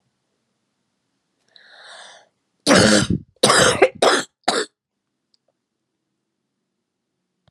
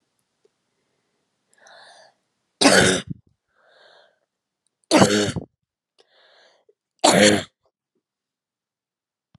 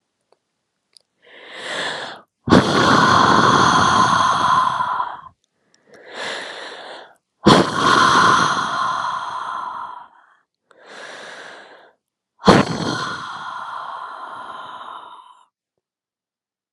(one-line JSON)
{"cough_length": "7.5 s", "cough_amplitude": 32767, "cough_signal_mean_std_ratio": 0.33, "three_cough_length": "9.4 s", "three_cough_amplitude": 30574, "three_cough_signal_mean_std_ratio": 0.28, "exhalation_length": "16.7 s", "exhalation_amplitude": 32768, "exhalation_signal_mean_std_ratio": 0.52, "survey_phase": "beta (2021-08-13 to 2022-03-07)", "age": "45-64", "gender": "Female", "wearing_mask": "No", "symptom_cough_any": true, "symptom_runny_or_blocked_nose": true, "symptom_fatigue": true, "symptom_fever_high_temperature": true, "symptom_headache": true, "symptom_onset": "4 days", "smoker_status": "Never smoked", "respiratory_condition_asthma": false, "respiratory_condition_other": false, "recruitment_source": "Test and Trace", "submission_delay": "1 day", "covid_test_result": "Positive", "covid_test_method": "RT-qPCR", "covid_ct_value": 19.5, "covid_ct_gene": "ORF1ab gene", "covid_ct_mean": 20.0, "covid_viral_load": "270000 copies/ml", "covid_viral_load_category": "Low viral load (10K-1M copies/ml)"}